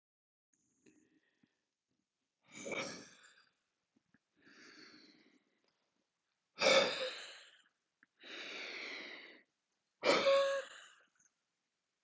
{
  "exhalation_length": "12.0 s",
  "exhalation_amplitude": 5298,
  "exhalation_signal_mean_std_ratio": 0.3,
  "survey_phase": "beta (2021-08-13 to 2022-03-07)",
  "age": "45-64",
  "gender": "Male",
  "wearing_mask": "No",
  "symptom_none": true,
  "smoker_status": "Never smoked",
  "respiratory_condition_asthma": false,
  "respiratory_condition_other": false,
  "recruitment_source": "REACT",
  "submission_delay": "1 day",
  "covid_test_result": "Negative",
  "covid_test_method": "RT-qPCR"
}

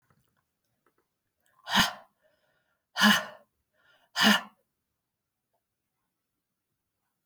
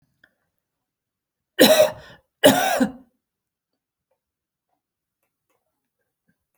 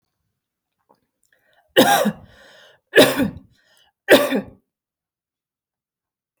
{
  "exhalation_length": "7.3 s",
  "exhalation_amplitude": 12790,
  "exhalation_signal_mean_std_ratio": 0.24,
  "cough_length": "6.6 s",
  "cough_amplitude": 32768,
  "cough_signal_mean_std_ratio": 0.25,
  "three_cough_length": "6.4 s",
  "three_cough_amplitude": 32768,
  "three_cough_signal_mean_std_ratio": 0.29,
  "survey_phase": "alpha (2021-03-01 to 2021-08-12)",
  "age": "45-64",
  "gender": "Female",
  "wearing_mask": "No",
  "symptom_none": true,
  "smoker_status": "Ex-smoker",
  "respiratory_condition_asthma": false,
  "respiratory_condition_other": false,
  "recruitment_source": "REACT",
  "submission_delay": "3 days",
  "covid_test_result": "Negative",
  "covid_test_method": "RT-qPCR"
}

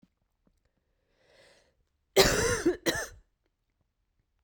{
  "cough_length": "4.4 s",
  "cough_amplitude": 17055,
  "cough_signal_mean_std_ratio": 0.31,
  "survey_phase": "beta (2021-08-13 to 2022-03-07)",
  "age": "18-44",
  "gender": "Female",
  "wearing_mask": "No",
  "symptom_cough_any": true,
  "symptom_runny_or_blocked_nose": true,
  "symptom_shortness_of_breath": true,
  "symptom_diarrhoea": true,
  "symptom_fatigue": true,
  "symptom_fever_high_temperature": true,
  "symptom_headache": true,
  "symptom_change_to_sense_of_smell_or_taste": true,
  "symptom_loss_of_taste": true,
  "symptom_onset": "5 days",
  "smoker_status": "Never smoked",
  "respiratory_condition_asthma": false,
  "respiratory_condition_other": false,
  "recruitment_source": "Test and Trace",
  "submission_delay": "2 days",
  "covid_test_result": "Positive",
  "covid_test_method": "RT-qPCR",
  "covid_ct_value": 14.7,
  "covid_ct_gene": "ORF1ab gene",
  "covid_ct_mean": 15.0,
  "covid_viral_load": "12000000 copies/ml",
  "covid_viral_load_category": "High viral load (>1M copies/ml)"
}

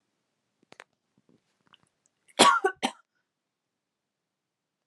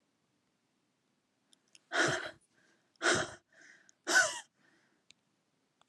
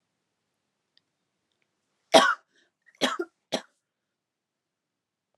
{
  "cough_length": "4.9 s",
  "cough_amplitude": 25190,
  "cough_signal_mean_std_ratio": 0.19,
  "exhalation_length": "5.9 s",
  "exhalation_amplitude": 5941,
  "exhalation_signal_mean_std_ratio": 0.3,
  "three_cough_length": "5.4 s",
  "three_cough_amplitude": 28174,
  "three_cough_signal_mean_std_ratio": 0.19,
  "survey_phase": "alpha (2021-03-01 to 2021-08-12)",
  "age": "18-44",
  "gender": "Female",
  "wearing_mask": "No",
  "symptom_none": true,
  "smoker_status": "Never smoked",
  "respiratory_condition_asthma": false,
  "respiratory_condition_other": false,
  "recruitment_source": "Test and Trace",
  "submission_delay": "2 days",
  "covid_test_result": "Positive",
  "covid_test_method": "RT-qPCR",
  "covid_ct_value": 33.5,
  "covid_ct_gene": "N gene",
  "covid_ct_mean": 33.5,
  "covid_viral_load": "10 copies/ml",
  "covid_viral_load_category": "Minimal viral load (< 10K copies/ml)"
}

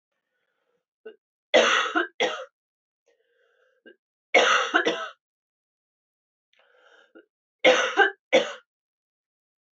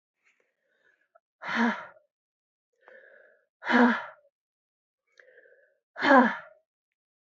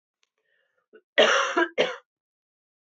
{
  "three_cough_length": "9.7 s",
  "three_cough_amplitude": 18939,
  "three_cough_signal_mean_std_ratio": 0.33,
  "exhalation_length": "7.3 s",
  "exhalation_amplitude": 17563,
  "exhalation_signal_mean_std_ratio": 0.28,
  "cough_length": "2.8 s",
  "cough_amplitude": 19780,
  "cough_signal_mean_std_ratio": 0.36,
  "survey_phase": "beta (2021-08-13 to 2022-03-07)",
  "age": "45-64",
  "gender": "Female",
  "wearing_mask": "No",
  "symptom_cough_any": true,
  "symptom_runny_or_blocked_nose": true,
  "symptom_shortness_of_breath": true,
  "symptom_sore_throat": true,
  "symptom_fatigue": true,
  "symptom_fever_high_temperature": true,
  "symptom_headache": true,
  "symptom_onset": "4 days",
  "smoker_status": "Never smoked",
  "respiratory_condition_asthma": false,
  "respiratory_condition_other": false,
  "recruitment_source": "Test and Trace",
  "submission_delay": "2 days",
  "covid_test_result": "Positive",
  "covid_test_method": "RT-qPCR",
  "covid_ct_value": 14.3,
  "covid_ct_gene": "ORF1ab gene"
}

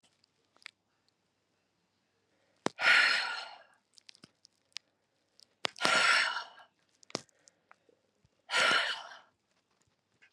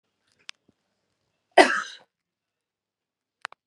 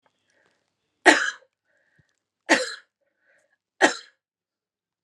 {
  "exhalation_length": "10.3 s",
  "exhalation_amplitude": 16894,
  "exhalation_signal_mean_std_ratio": 0.32,
  "cough_length": "3.7 s",
  "cough_amplitude": 32357,
  "cough_signal_mean_std_ratio": 0.17,
  "three_cough_length": "5.0 s",
  "three_cough_amplitude": 31120,
  "three_cough_signal_mean_std_ratio": 0.22,
  "survey_phase": "beta (2021-08-13 to 2022-03-07)",
  "age": "45-64",
  "gender": "Female",
  "wearing_mask": "Yes",
  "symptom_headache": true,
  "symptom_onset": "2 days",
  "smoker_status": "Never smoked",
  "respiratory_condition_asthma": false,
  "respiratory_condition_other": false,
  "recruitment_source": "Test and Trace",
  "submission_delay": "1 day",
  "covid_test_result": "Positive",
  "covid_test_method": "RT-qPCR"
}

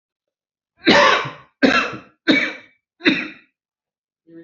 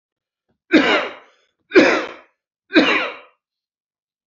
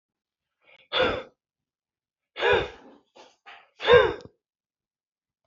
{
  "cough_length": "4.4 s",
  "cough_amplitude": 28068,
  "cough_signal_mean_std_ratio": 0.4,
  "three_cough_length": "4.3 s",
  "three_cough_amplitude": 29725,
  "three_cough_signal_mean_std_ratio": 0.38,
  "exhalation_length": "5.5 s",
  "exhalation_amplitude": 20612,
  "exhalation_signal_mean_std_ratio": 0.29,
  "survey_phase": "alpha (2021-03-01 to 2021-08-12)",
  "age": "45-64",
  "gender": "Male",
  "wearing_mask": "No",
  "symptom_fatigue": true,
  "symptom_onset": "12 days",
  "smoker_status": "Never smoked",
  "respiratory_condition_asthma": false,
  "respiratory_condition_other": false,
  "recruitment_source": "REACT",
  "submission_delay": "2 days",
  "covid_test_result": "Negative",
  "covid_test_method": "RT-qPCR"
}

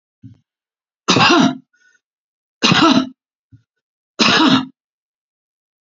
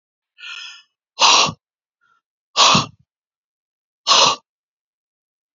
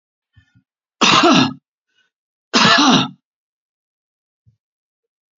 {
  "three_cough_length": "5.8 s",
  "three_cough_amplitude": 31344,
  "three_cough_signal_mean_std_ratio": 0.4,
  "exhalation_length": "5.5 s",
  "exhalation_amplitude": 31826,
  "exhalation_signal_mean_std_ratio": 0.33,
  "cough_length": "5.4 s",
  "cough_amplitude": 30903,
  "cough_signal_mean_std_ratio": 0.36,
  "survey_phase": "beta (2021-08-13 to 2022-03-07)",
  "age": "65+",
  "gender": "Male",
  "wearing_mask": "No",
  "symptom_none": true,
  "smoker_status": "Ex-smoker",
  "respiratory_condition_asthma": false,
  "respiratory_condition_other": false,
  "recruitment_source": "REACT",
  "submission_delay": "5 days",
  "covid_test_result": "Negative",
  "covid_test_method": "RT-qPCR",
  "influenza_a_test_result": "Negative",
  "influenza_b_test_result": "Negative"
}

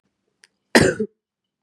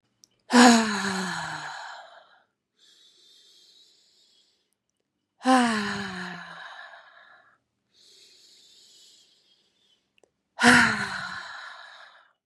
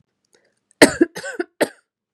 {
  "cough_length": "1.6 s",
  "cough_amplitude": 32712,
  "cough_signal_mean_std_ratio": 0.28,
  "exhalation_length": "12.5 s",
  "exhalation_amplitude": 30181,
  "exhalation_signal_mean_std_ratio": 0.32,
  "three_cough_length": "2.1 s",
  "three_cough_amplitude": 32768,
  "three_cough_signal_mean_std_ratio": 0.25,
  "survey_phase": "beta (2021-08-13 to 2022-03-07)",
  "age": "18-44",
  "gender": "Female",
  "wearing_mask": "Yes",
  "symptom_cough_any": true,
  "symptom_runny_or_blocked_nose": true,
  "symptom_fatigue": true,
  "symptom_other": true,
  "smoker_status": "Never smoked",
  "respiratory_condition_asthma": false,
  "respiratory_condition_other": false,
  "recruitment_source": "Test and Trace",
  "submission_delay": "2 days",
  "covid_test_result": "Positive",
  "covid_test_method": "LFT"
}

